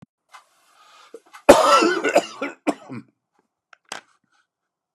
cough_length: 4.9 s
cough_amplitude: 32768
cough_signal_mean_std_ratio: 0.3
survey_phase: beta (2021-08-13 to 2022-03-07)
age: 45-64
gender: Male
wearing_mask: 'No'
symptom_cough_any: true
symptom_shortness_of_breath: true
symptom_fatigue: true
symptom_headache: true
symptom_change_to_sense_of_smell_or_taste: true
symptom_onset: 12 days
smoker_status: Never smoked
respiratory_condition_asthma: false
respiratory_condition_other: false
recruitment_source: REACT
submission_delay: 0 days
covid_test_result: Negative
covid_test_method: RT-qPCR
influenza_a_test_result: Negative
influenza_b_test_result: Negative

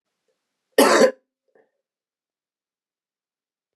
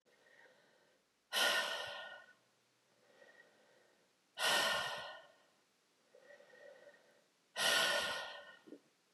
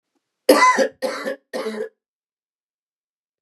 cough_length: 3.8 s
cough_amplitude: 28834
cough_signal_mean_std_ratio: 0.23
exhalation_length: 9.1 s
exhalation_amplitude: 3097
exhalation_signal_mean_std_ratio: 0.42
three_cough_length: 3.4 s
three_cough_amplitude: 32495
three_cough_signal_mean_std_ratio: 0.36
survey_phase: beta (2021-08-13 to 2022-03-07)
age: 18-44
gender: Male
wearing_mask: 'No'
symptom_cough_any: true
symptom_new_continuous_cough: true
symptom_runny_or_blocked_nose: true
symptom_shortness_of_breath: true
symptom_headache: true
symptom_other: true
symptom_onset: 3 days
smoker_status: Never smoked
respiratory_condition_asthma: false
respiratory_condition_other: false
recruitment_source: Test and Trace
submission_delay: 2 days
covid_test_result: Positive
covid_test_method: RT-qPCR
covid_ct_value: 18.1
covid_ct_gene: ORF1ab gene
covid_ct_mean: 18.4
covid_viral_load: 950000 copies/ml
covid_viral_load_category: Low viral load (10K-1M copies/ml)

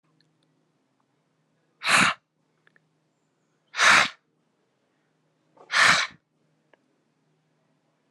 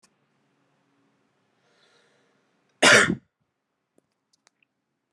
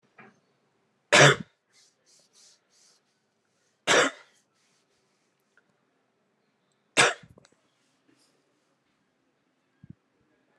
exhalation_length: 8.1 s
exhalation_amplitude: 23115
exhalation_signal_mean_std_ratio: 0.27
cough_length: 5.1 s
cough_amplitude: 29802
cough_signal_mean_std_ratio: 0.19
three_cough_length: 10.6 s
three_cough_amplitude: 21287
three_cough_signal_mean_std_ratio: 0.19
survey_phase: alpha (2021-03-01 to 2021-08-12)
age: 18-44
gender: Male
wearing_mask: 'No'
symptom_cough_any: true
symptom_new_continuous_cough: true
symptom_fatigue: true
symptom_onset: 4 days
smoker_status: Never smoked
respiratory_condition_asthma: true
respiratory_condition_other: false
recruitment_source: Test and Trace
submission_delay: 2 days
covid_test_result: Positive
covid_test_method: RT-qPCR
covid_ct_value: 31.1
covid_ct_gene: ORF1ab gene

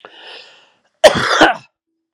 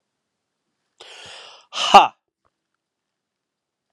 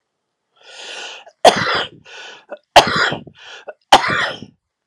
cough_length: 2.1 s
cough_amplitude: 32768
cough_signal_mean_std_ratio: 0.36
exhalation_length: 3.9 s
exhalation_amplitude: 32768
exhalation_signal_mean_std_ratio: 0.18
three_cough_length: 4.9 s
three_cough_amplitude: 32768
three_cough_signal_mean_std_ratio: 0.36
survey_phase: beta (2021-08-13 to 2022-03-07)
age: 45-64
gender: Male
wearing_mask: 'No'
symptom_runny_or_blocked_nose: true
symptom_onset: 5 days
smoker_status: Ex-smoker
respiratory_condition_asthma: false
respiratory_condition_other: false
recruitment_source: Test and Trace
submission_delay: 1 day
covid_test_result: Positive
covid_test_method: RT-qPCR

